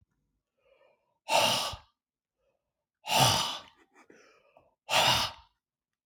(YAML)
exhalation_length: 6.1 s
exhalation_amplitude: 13555
exhalation_signal_mean_std_ratio: 0.38
survey_phase: beta (2021-08-13 to 2022-03-07)
age: 45-64
gender: Male
wearing_mask: 'No'
symptom_none: true
smoker_status: Never smoked
respiratory_condition_asthma: false
respiratory_condition_other: false
recruitment_source: REACT
submission_delay: 1 day
covid_test_result: Negative
covid_test_method: RT-qPCR